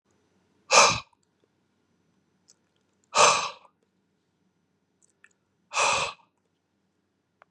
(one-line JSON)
{"exhalation_length": "7.5 s", "exhalation_amplitude": 27819, "exhalation_signal_mean_std_ratio": 0.26, "survey_phase": "beta (2021-08-13 to 2022-03-07)", "age": "45-64", "gender": "Male", "wearing_mask": "No", "symptom_cough_any": true, "symptom_runny_or_blocked_nose": true, "symptom_onset": "3 days", "smoker_status": "Never smoked", "respiratory_condition_asthma": false, "respiratory_condition_other": false, "recruitment_source": "Test and Trace", "submission_delay": "2 days", "covid_test_result": "Positive", "covid_test_method": "RT-qPCR", "covid_ct_value": 21.1, "covid_ct_gene": "N gene", "covid_ct_mean": 21.3, "covid_viral_load": "110000 copies/ml", "covid_viral_load_category": "Low viral load (10K-1M copies/ml)"}